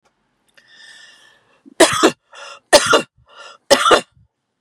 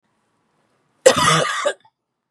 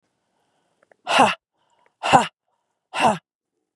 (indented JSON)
{
  "three_cough_length": "4.6 s",
  "three_cough_amplitude": 32768,
  "three_cough_signal_mean_std_ratio": 0.33,
  "cough_length": "2.3 s",
  "cough_amplitude": 32768,
  "cough_signal_mean_std_ratio": 0.38,
  "exhalation_length": "3.8 s",
  "exhalation_amplitude": 32738,
  "exhalation_signal_mean_std_ratio": 0.31,
  "survey_phase": "beta (2021-08-13 to 2022-03-07)",
  "age": "45-64",
  "gender": "Female",
  "wearing_mask": "No",
  "symptom_none": true,
  "smoker_status": "Ex-smoker",
  "respiratory_condition_asthma": false,
  "respiratory_condition_other": false,
  "recruitment_source": "REACT",
  "submission_delay": "2 days",
  "covid_test_result": "Negative",
  "covid_test_method": "RT-qPCR",
  "influenza_a_test_result": "Negative",
  "influenza_b_test_result": "Negative"
}